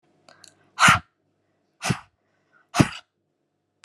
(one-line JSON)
{"exhalation_length": "3.8 s", "exhalation_amplitude": 30910, "exhalation_signal_mean_std_ratio": 0.24, "survey_phase": "alpha (2021-03-01 to 2021-08-12)", "age": "18-44", "gender": "Female", "wearing_mask": "No", "symptom_none": true, "smoker_status": "Ex-smoker", "respiratory_condition_asthma": false, "respiratory_condition_other": false, "recruitment_source": "REACT", "submission_delay": "3 days", "covid_test_result": "Negative", "covid_test_method": "RT-qPCR"}